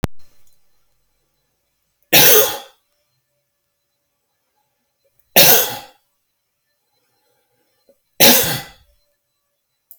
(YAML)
three_cough_length: 10.0 s
three_cough_amplitude: 32768
three_cough_signal_mean_std_ratio: 0.28
survey_phase: beta (2021-08-13 to 2022-03-07)
age: 65+
gender: Male
wearing_mask: 'No'
symptom_none: true
smoker_status: Never smoked
respiratory_condition_asthma: false
respiratory_condition_other: false
recruitment_source: REACT
submission_delay: 1 day
covid_test_result: Negative
covid_test_method: RT-qPCR